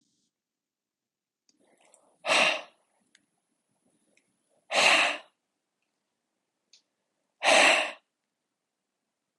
{
  "exhalation_length": "9.4 s",
  "exhalation_amplitude": 13827,
  "exhalation_signal_mean_std_ratio": 0.28,
  "survey_phase": "beta (2021-08-13 to 2022-03-07)",
  "age": "45-64",
  "gender": "Male",
  "wearing_mask": "No",
  "symptom_cough_any": true,
  "symptom_runny_or_blocked_nose": true,
  "symptom_sore_throat": true,
  "symptom_fatigue": true,
  "symptom_fever_high_temperature": true,
  "symptom_headache": true,
  "smoker_status": "Ex-smoker",
  "respiratory_condition_asthma": false,
  "respiratory_condition_other": false,
  "recruitment_source": "Test and Trace",
  "submission_delay": "3 days",
  "covid_test_result": "Negative",
  "covid_test_method": "RT-qPCR"
}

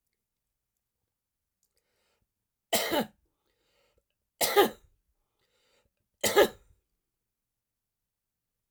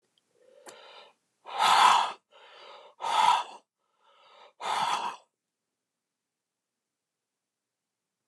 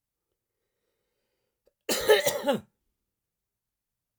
{
  "three_cough_length": "8.7 s",
  "three_cough_amplitude": 13657,
  "three_cough_signal_mean_std_ratio": 0.22,
  "exhalation_length": "8.3 s",
  "exhalation_amplitude": 12988,
  "exhalation_signal_mean_std_ratio": 0.33,
  "cough_length": "4.2 s",
  "cough_amplitude": 13670,
  "cough_signal_mean_std_ratio": 0.27,
  "survey_phase": "alpha (2021-03-01 to 2021-08-12)",
  "age": "45-64",
  "gender": "Male",
  "wearing_mask": "No",
  "symptom_none": true,
  "smoker_status": "Never smoked",
  "respiratory_condition_asthma": false,
  "respiratory_condition_other": false,
  "recruitment_source": "REACT",
  "submission_delay": "1 day",
  "covid_test_result": "Negative",
  "covid_test_method": "RT-qPCR"
}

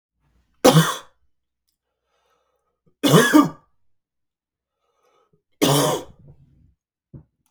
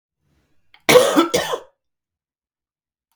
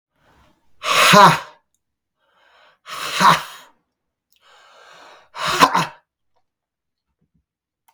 {
  "three_cough_length": "7.5 s",
  "three_cough_amplitude": 32768,
  "three_cough_signal_mean_std_ratio": 0.3,
  "cough_length": "3.2 s",
  "cough_amplitude": 32768,
  "cough_signal_mean_std_ratio": 0.32,
  "exhalation_length": "7.9 s",
  "exhalation_amplitude": 32768,
  "exhalation_signal_mean_std_ratio": 0.31,
  "survey_phase": "beta (2021-08-13 to 2022-03-07)",
  "age": "45-64",
  "gender": "Male",
  "wearing_mask": "No",
  "symptom_cough_any": true,
  "symptom_runny_or_blocked_nose": true,
  "symptom_headache": true,
  "symptom_other": true,
  "symptom_onset": "3 days",
  "smoker_status": "Never smoked",
  "respiratory_condition_asthma": false,
  "respiratory_condition_other": false,
  "recruitment_source": "Test and Trace",
  "submission_delay": "1 day",
  "covid_test_result": "Positive",
  "covid_test_method": "RT-qPCR",
  "covid_ct_value": 22.7,
  "covid_ct_gene": "ORF1ab gene"
}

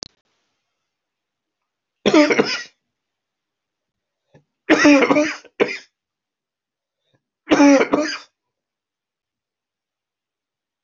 {
  "three_cough_length": "10.8 s",
  "three_cough_amplitude": 25330,
  "three_cough_signal_mean_std_ratio": 0.31,
  "survey_phase": "beta (2021-08-13 to 2022-03-07)",
  "age": "65+",
  "gender": "Male",
  "wearing_mask": "No",
  "symptom_cough_any": true,
  "symptom_onset": "2 days",
  "smoker_status": "Never smoked",
  "respiratory_condition_asthma": false,
  "respiratory_condition_other": false,
  "recruitment_source": "Test and Trace",
  "submission_delay": "2 days",
  "covid_test_result": "Positive",
  "covid_test_method": "RT-qPCR",
  "covid_ct_value": 22.7,
  "covid_ct_gene": "ORF1ab gene",
  "covid_ct_mean": 23.1,
  "covid_viral_load": "26000 copies/ml",
  "covid_viral_load_category": "Low viral load (10K-1M copies/ml)"
}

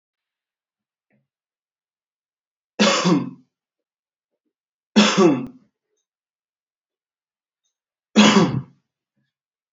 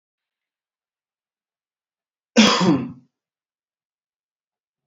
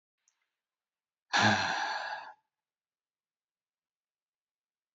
{
  "three_cough_length": "9.7 s",
  "three_cough_amplitude": 27658,
  "three_cough_signal_mean_std_ratio": 0.29,
  "cough_length": "4.9 s",
  "cough_amplitude": 27622,
  "cough_signal_mean_std_ratio": 0.25,
  "exhalation_length": "4.9 s",
  "exhalation_amplitude": 7266,
  "exhalation_signal_mean_std_ratio": 0.31,
  "survey_phase": "alpha (2021-03-01 to 2021-08-12)",
  "age": "18-44",
  "gender": "Male",
  "wearing_mask": "Yes",
  "symptom_none": true,
  "smoker_status": "Never smoked",
  "recruitment_source": "Test and Trace",
  "submission_delay": "2 days",
  "covid_test_result": "Positive",
  "covid_test_method": "RT-qPCR",
  "covid_ct_value": 32.3,
  "covid_ct_gene": "ORF1ab gene",
  "covid_ct_mean": 33.1,
  "covid_viral_load": "14 copies/ml",
  "covid_viral_load_category": "Minimal viral load (< 10K copies/ml)"
}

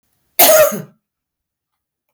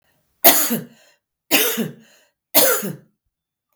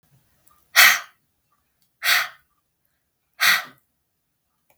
{
  "cough_length": "2.1 s",
  "cough_amplitude": 32768,
  "cough_signal_mean_std_ratio": 0.36,
  "three_cough_length": "3.8 s",
  "three_cough_amplitude": 32768,
  "three_cough_signal_mean_std_ratio": 0.4,
  "exhalation_length": "4.8 s",
  "exhalation_amplitude": 32768,
  "exhalation_signal_mean_std_ratio": 0.28,
  "survey_phase": "beta (2021-08-13 to 2022-03-07)",
  "age": "45-64",
  "gender": "Female",
  "wearing_mask": "No",
  "symptom_none": true,
  "symptom_onset": "5 days",
  "smoker_status": "Never smoked",
  "respiratory_condition_asthma": false,
  "respiratory_condition_other": false,
  "recruitment_source": "REACT",
  "submission_delay": "2 days",
  "covid_test_result": "Negative",
  "covid_test_method": "RT-qPCR",
  "influenza_a_test_result": "Negative",
  "influenza_b_test_result": "Negative"
}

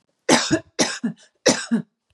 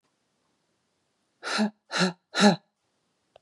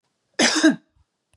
{
  "three_cough_length": "2.1 s",
  "three_cough_amplitude": 31580,
  "three_cough_signal_mean_std_ratio": 0.47,
  "exhalation_length": "3.4 s",
  "exhalation_amplitude": 16029,
  "exhalation_signal_mean_std_ratio": 0.32,
  "cough_length": "1.4 s",
  "cough_amplitude": 22018,
  "cough_signal_mean_std_ratio": 0.41,
  "survey_phase": "beta (2021-08-13 to 2022-03-07)",
  "age": "18-44",
  "gender": "Female",
  "wearing_mask": "No",
  "symptom_none": true,
  "smoker_status": "Never smoked",
  "respiratory_condition_asthma": false,
  "respiratory_condition_other": false,
  "recruitment_source": "REACT",
  "submission_delay": "2 days",
  "covid_test_result": "Negative",
  "covid_test_method": "RT-qPCR",
  "influenza_a_test_result": "Negative",
  "influenza_b_test_result": "Negative"
}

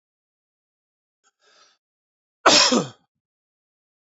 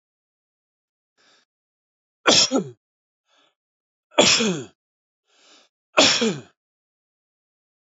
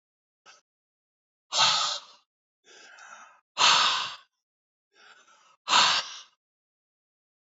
{
  "cough_length": "4.2 s",
  "cough_amplitude": 27783,
  "cough_signal_mean_std_ratio": 0.23,
  "three_cough_length": "7.9 s",
  "three_cough_amplitude": 27741,
  "three_cough_signal_mean_std_ratio": 0.29,
  "exhalation_length": "7.4 s",
  "exhalation_amplitude": 17077,
  "exhalation_signal_mean_std_ratio": 0.34,
  "survey_phase": "beta (2021-08-13 to 2022-03-07)",
  "age": "65+",
  "gender": "Male",
  "wearing_mask": "No",
  "symptom_none": true,
  "smoker_status": "Never smoked",
  "respiratory_condition_asthma": false,
  "respiratory_condition_other": false,
  "recruitment_source": "REACT",
  "submission_delay": "2 days",
  "covid_test_result": "Negative",
  "covid_test_method": "RT-qPCR",
  "influenza_a_test_result": "Negative",
  "influenza_b_test_result": "Negative"
}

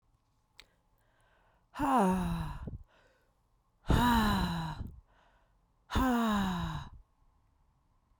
{
  "exhalation_length": "8.2 s",
  "exhalation_amplitude": 6408,
  "exhalation_signal_mean_std_ratio": 0.49,
  "survey_phase": "beta (2021-08-13 to 2022-03-07)",
  "age": "18-44",
  "gender": "Female",
  "wearing_mask": "No",
  "symptom_cough_any": true,
  "symptom_runny_or_blocked_nose": true,
  "symptom_sore_throat": true,
  "symptom_fatigue": true,
  "symptom_change_to_sense_of_smell_or_taste": true,
  "symptom_onset": "3 days",
  "smoker_status": "Never smoked",
  "respiratory_condition_asthma": false,
  "respiratory_condition_other": false,
  "recruitment_source": "Test and Trace",
  "submission_delay": "2 days",
  "covid_test_result": "Positive",
  "covid_test_method": "RT-qPCR"
}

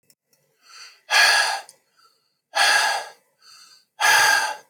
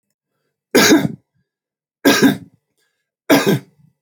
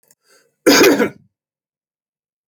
{
  "exhalation_length": "4.7 s",
  "exhalation_amplitude": 20204,
  "exhalation_signal_mean_std_ratio": 0.48,
  "three_cough_length": "4.0 s",
  "three_cough_amplitude": 30662,
  "three_cough_signal_mean_std_ratio": 0.39,
  "cough_length": "2.5 s",
  "cough_amplitude": 31820,
  "cough_signal_mean_std_ratio": 0.34,
  "survey_phase": "alpha (2021-03-01 to 2021-08-12)",
  "age": "45-64",
  "gender": "Male",
  "wearing_mask": "No",
  "symptom_none": true,
  "smoker_status": "Never smoked",
  "respiratory_condition_asthma": false,
  "respiratory_condition_other": false,
  "recruitment_source": "REACT",
  "submission_delay": "1 day",
  "covid_test_result": "Negative",
  "covid_test_method": "RT-qPCR"
}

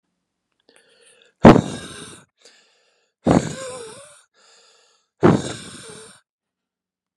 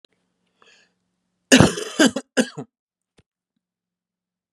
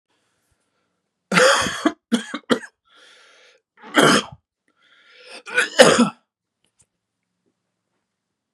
{
  "exhalation_length": "7.2 s",
  "exhalation_amplitude": 32768,
  "exhalation_signal_mean_std_ratio": 0.23,
  "cough_length": "4.5 s",
  "cough_amplitude": 32768,
  "cough_signal_mean_std_ratio": 0.24,
  "three_cough_length": "8.5 s",
  "three_cough_amplitude": 32768,
  "three_cough_signal_mean_std_ratio": 0.31,
  "survey_phase": "beta (2021-08-13 to 2022-03-07)",
  "age": "18-44",
  "gender": "Male",
  "wearing_mask": "No",
  "symptom_cough_any": true,
  "symptom_sore_throat": true,
  "symptom_fatigue": true,
  "symptom_headache": true,
  "symptom_onset": "2 days",
  "smoker_status": "Ex-smoker",
  "respiratory_condition_asthma": false,
  "respiratory_condition_other": false,
  "recruitment_source": "Test and Trace",
  "submission_delay": "1 day",
  "covid_test_result": "Positive",
  "covid_test_method": "RT-qPCR"
}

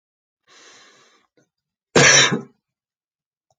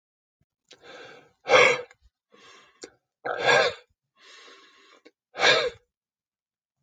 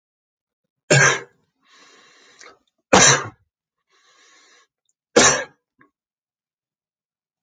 {
  "cough_length": "3.6 s",
  "cough_amplitude": 32767,
  "cough_signal_mean_std_ratio": 0.28,
  "exhalation_length": "6.8 s",
  "exhalation_amplitude": 21341,
  "exhalation_signal_mean_std_ratio": 0.31,
  "three_cough_length": "7.4 s",
  "three_cough_amplitude": 31372,
  "three_cough_signal_mean_std_ratio": 0.27,
  "survey_phase": "beta (2021-08-13 to 2022-03-07)",
  "age": "65+",
  "gender": "Male",
  "wearing_mask": "No",
  "symptom_none": true,
  "smoker_status": "Never smoked",
  "respiratory_condition_asthma": false,
  "respiratory_condition_other": false,
  "recruitment_source": "Test and Trace",
  "submission_delay": "0 days",
  "covid_test_result": "Negative",
  "covid_test_method": "LFT"
}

